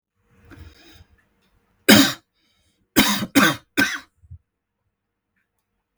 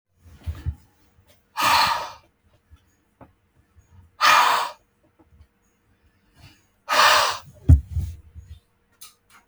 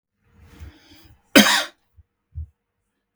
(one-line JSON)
{"three_cough_length": "6.0 s", "three_cough_amplitude": 32768, "three_cough_signal_mean_std_ratio": 0.29, "exhalation_length": "9.5 s", "exhalation_amplitude": 25938, "exhalation_signal_mean_std_ratio": 0.34, "cough_length": "3.2 s", "cough_amplitude": 32768, "cough_signal_mean_std_ratio": 0.24, "survey_phase": "beta (2021-08-13 to 2022-03-07)", "age": "45-64", "gender": "Male", "wearing_mask": "No", "symptom_fatigue": true, "smoker_status": "Ex-smoker", "respiratory_condition_asthma": false, "respiratory_condition_other": false, "recruitment_source": "REACT", "submission_delay": "2 days", "covid_test_result": "Negative", "covid_test_method": "RT-qPCR", "influenza_a_test_result": "Negative", "influenza_b_test_result": "Negative"}